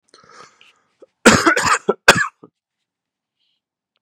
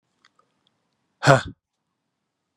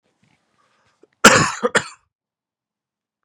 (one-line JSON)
{"three_cough_length": "4.0 s", "three_cough_amplitude": 32768, "three_cough_signal_mean_std_ratio": 0.3, "exhalation_length": "2.6 s", "exhalation_amplitude": 32767, "exhalation_signal_mean_std_ratio": 0.19, "cough_length": "3.2 s", "cough_amplitude": 32768, "cough_signal_mean_std_ratio": 0.25, "survey_phase": "beta (2021-08-13 to 2022-03-07)", "age": "45-64", "gender": "Male", "wearing_mask": "No", "symptom_cough_any": true, "symptom_new_continuous_cough": true, "symptom_runny_or_blocked_nose": true, "symptom_shortness_of_breath": true, "symptom_fatigue": true, "symptom_onset": "1 day", "smoker_status": "Never smoked", "respiratory_condition_asthma": false, "respiratory_condition_other": false, "recruitment_source": "Test and Trace", "submission_delay": "1 day", "covid_test_result": "Positive", "covid_test_method": "RT-qPCR", "covid_ct_value": 18.3, "covid_ct_gene": "ORF1ab gene", "covid_ct_mean": 18.5, "covid_viral_load": "830000 copies/ml", "covid_viral_load_category": "Low viral load (10K-1M copies/ml)"}